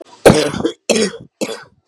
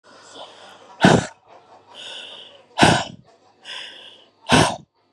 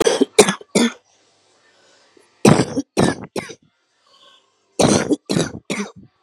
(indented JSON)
{
  "cough_length": "1.9 s",
  "cough_amplitude": 32768,
  "cough_signal_mean_std_ratio": 0.46,
  "exhalation_length": "5.1 s",
  "exhalation_amplitude": 31703,
  "exhalation_signal_mean_std_ratio": 0.34,
  "three_cough_length": "6.2 s",
  "three_cough_amplitude": 32768,
  "three_cough_signal_mean_std_ratio": 0.39,
  "survey_phase": "beta (2021-08-13 to 2022-03-07)",
  "age": "18-44",
  "gender": "Male",
  "wearing_mask": "No",
  "symptom_cough_any": true,
  "symptom_runny_or_blocked_nose": true,
  "symptom_shortness_of_breath": true,
  "symptom_fatigue": true,
  "symptom_fever_high_temperature": true,
  "symptom_headache": true,
  "symptom_other": true,
  "smoker_status": "Current smoker (11 or more cigarettes per day)",
  "respiratory_condition_asthma": true,
  "respiratory_condition_other": false,
  "recruitment_source": "Test and Trace",
  "submission_delay": "0 days",
  "covid_test_result": "Positive",
  "covid_test_method": "LFT"
}